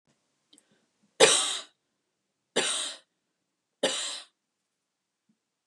{"three_cough_length": "5.7 s", "three_cough_amplitude": 20852, "three_cough_signal_mean_std_ratio": 0.29, "survey_phase": "beta (2021-08-13 to 2022-03-07)", "age": "45-64", "gender": "Female", "wearing_mask": "No", "symptom_none": true, "symptom_onset": "12 days", "smoker_status": "Ex-smoker", "respiratory_condition_asthma": false, "respiratory_condition_other": false, "recruitment_source": "REACT", "submission_delay": "1 day", "covid_test_result": "Negative", "covid_test_method": "RT-qPCR", "influenza_a_test_result": "Negative", "influenza_b_test_result": "Negative"}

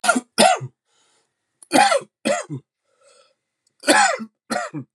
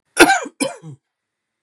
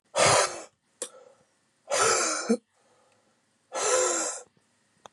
{"three_cough_length": "4.9 s", "three_cough_amplitude": 30149, "three_cough_signal_mean_std_ratio": 0.41, "cough_length": "1.6 s", "cough_amplitude": 32768, "cough_signal_mean_std_ratio": 0.33, "exhalation_length": "5.1 s", "exhalation_amplitude": 12253, "exhalation_signal_mean_std_ratio": 0.47, "survey_phase": "beta (2021-08-13 to 2022-03-07)", "age": "45-64", "gender": "Male", "wearing_mask": "No", "symptom_runny_or_blocked_nose": true, "symptom_other": true, "symptom_onset": "6 days", "smoker_status": "Ex-smoker", "respiratory_condition_asthma": false, "respiratory_condition_other": false, "recruitment_source": "Test and Trace", "submission_delay": "2 days", "covid_test_result": "Positive", "covid_test_method": "RT-qPCR"}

